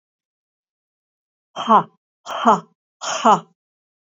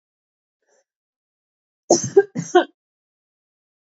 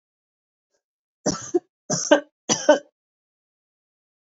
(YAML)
exhalation_length: 4.1 s
exhalation_amplitude: 26773
exhalation_signal_mean_std_ratio: 0.3
cough_length: 3.9 s
cough_amplitude: 29226
cough_signal_mean_std_ratio: 0.22
three_cough_length: 4.3 s
three_cough_amplitude: 29140
three_cough_signal_mean_std_ratio: 0.26
survey_phase: beta (2021-08-13 to 2022-03-07)
age: 65+
gender: Female
wearing_mask: 'No'
symptom_none: true
smoker_status: Never smoked
respiratory_condition_asthma: false
respiratory_condition_other: false
recruitment_source: REACT
submission_delay: 1 day
covid_test_result: Negative
covid_test_method: RT-qPCR
influenza_a_test_result: Negative
influenza_b_test_result: Negative